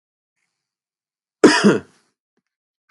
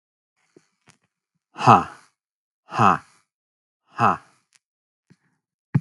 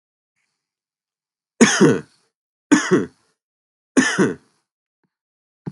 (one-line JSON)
{"cough_length": "2.9 s", "cough_amplitude": 32767, "cough_signal_mean_std_ratio": 0.26, "exhalation_length": "5.8 s", "exhalation_amplitude": 32766, "exhalation_signal_mean_std_ratio": 0.24, "three_cough_length": "5.7 s", "three_cough_amplitude": 32767, "three_cough_signal_mean_std_ratio": 0.32, "survey_phase": "beta (2021-08-13 to 2022-03-07)", "age": "18-44", "gender": "Male", "wearing_mask": "No", "symptom_none": true, "smoker_status": "Never smoked", "respiratory_condition_asthma": false, "respiratory_condition_other": false, "recruitment_source": "REACT", "submission_delay": "0 days", "covid_test_result": "Negative", "covid_test_method": "RT-qPCR", "influenza_a_test_result": "Negative", "influenza_b_test_result": "Negative"}